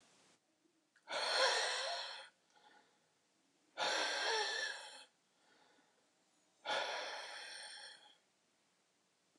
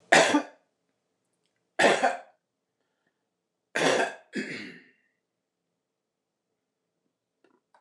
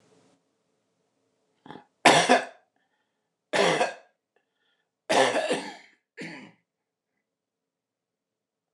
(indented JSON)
{
  "exhalation_length": "9.4 s",
  "exhalation_amplitude": 3306,
  "exhalation_signal_mean_std_ratio": 0.48,
  "three_cough_length": "7.8 s",
  "three_cough_amplitude": 28258,
  "three_cough_signal_mean_std_ratio": 0.29,
  "cough_length": "8.7 s",
  "cough_amplitude": 24235,
  "cough_signal_mean_std_ratio": 0.29,
  "survey_phase": "beta (2021-08-13 to 2022-03-07)",
  "age": "65+",
  "gender": "Male",
  "wearing_mask": "No",
  "symptom_cough_any": true,
  "symptom_fatigue": true,
  "symptom_headache": true,
  "symptom_onset": "6 days",
  "smoker_status": "Never smoked",
  "respiratory_condition_asthma": false,
  "respiratory_condition_other": false,
  "recruitment_source": "REACT",
  "submission_delay": "5 days",
  "covid_test_result": "Negative",
  "covid_test_method": "RT-qPCR",
  "influenza_a_test_result": "Negative",
  "influenza_b_test_result": "Negative"
}